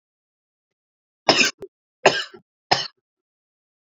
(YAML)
three_cough_length: 3.9 s
three_cough_amplitude: 31078
three_cough_signal_mean_std_ratio: 0.25
survey_phase: beta (2021-08-13 to 2022-03-07)
age: 18-44
gender: Male
wearing_mask: 'No'
symptom_none: true
smoker_status: Current smoker (e-cigarettes or vapes only)
respiratory_condition_asthma: false
respiratory_condition_other: false
recruitment_source: REACT
submission_delay: 4 days
covid_test_result: Negative
covid_test_method: RT-qPCR